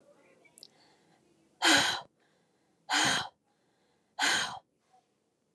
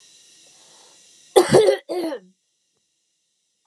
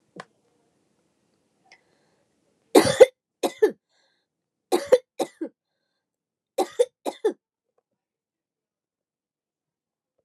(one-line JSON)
{"exhalation_length": "5.5 s", "exhalation_amplitude": 9185, "exhalation_signal_mean_std_ratio": 0.35, "cough_length": "3.7 s", "cough_amplitude": 29204, "cough_signal_mean_std_ratio": 0.31, "three_cough_length": "10.2 s", "three_cough_amplitude": 29204, "three_cough_signal_mean_std_ratio": 0.19, "survey_phase": "beta (2021-08-13 to 2022-03-07)", "age": "45-64", "gender": "Female", "wearing_mask": "No", "symptom_none": true, "smoker_status": "Never smoked", "respiratory_condition_asthma": false, "respiratory_condition_other": false, "recruitment_source": "REACT", "submission_delay": "4 days", "covid_test_result": "Negative", "covid_test_method": "RT-qPCR"}